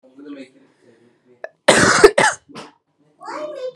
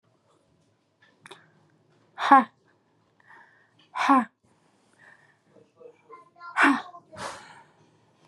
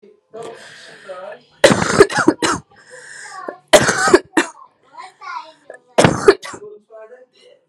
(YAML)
cough_length: 3.8 s
cough_amplitude: 32768
cough_signal_mean_std_ratio: 0.35
exhalation_length: 8.3 s
exhalation_amplitude: 21422
exhalation_signal_mean_std_ratio: 0.25
three_cough_length: 7.7 s
three_cough_amplitude: 32768
three_cough_signal_mean_std_ratio: 0.37
survey_phase: beta (2021-08-13 to 2022-03-07)
age: 18-44
gender: Female
wearing_mask: 'No'
symptom_runny_or_blocked_nose: true
symptom_sore_throat: true
symptom_fatigue: true
symptom_headache: true
symptom_change_to_sense_of_smell_or_taste: true
symptom_other: true
symptom_onset: 2 days
smoker_status: Current smoker (e-cigarettes or vapes only)
respiratory_condition_asthma: false
respiratory_condition_other: false
recruitment_source: Test and Trace
submission_delay: 1 day
covid_test_result: Positive
covid_test_method: RT-qPCR
covid_ct_value: 23.4
covid_ct_gene: ORF1ab gene
covid_ct_mean: 23.8
covid_viral_load: 16000 copies/ml
covid_viral_load_category: Low viral load (10K-1M copies/ml)